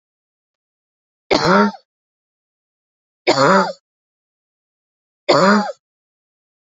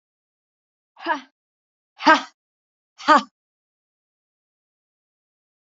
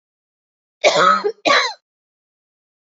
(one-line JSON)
{"three_cough_length": "6.7 s", "three_cough_amplitude": 28702, "three_cough_signal_mean_std_ratio": 0.34, "exhalation_length": "5.6 s", "exhalation_amplitude": 27748, "exhalation_signal_mean_std_ratio": 0.19, "cough_length": "2.8 s", "cough_amplitude": 28017, "cough_signal_mean_std_ratio": 0.4, "survey_phase": "beta (2021-08-13 to 2022-03-07)", "age": "18-44", "gender": "Female", "wearing_mask": "No", "symptom_cough_any": true, "symptom_runny_or_blocked_nose": true, "symptom_sore_throat": true, "symptom_headache": true, "symptom_change_to_sense_of_smell_or_taste": true, "symptom_loss_of_taste": true, "symptom_onset": "4 days", "smoker_status": "Never smoked", "respiratory_condition_asthma": false, "respiratory_condition_other": false, "recruitment_source": "Test and Trace", "submission_delay": "2 days", "covid_test_result": "Positive", "covid_test_method": "RT-qPCR", "covid_ct_value": 19.7, "covid_ct_gene": "ORF1ab gene", "covid_ct_mean": 20.1, "covid_viral_load": "250000 copies/ml", "covid_viral_load_category": "Low viral load (10K-1M copies/ml)"}